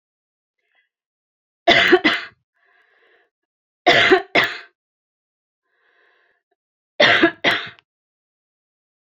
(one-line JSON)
{"three_cough_length": "9.0 s", "three_cough_amplitude": 29800, "three_cough_signal_mean_std_ratio": 0.31, "survey_phase": "beta (2021-08-13 to 2022-03-07)", "age": "65+", "gender": "Female", "wearing_mask": "No", "symptom_none": true, "smoker_status": "Never smoked", "respiratory_condition_asthma": false, "respiratory_condition_other": false, "recruitment_source": "REACT", "submission_delay": "2 days", "covid_test_result": "Negative", "covid_test_method": "RT-qPCR"}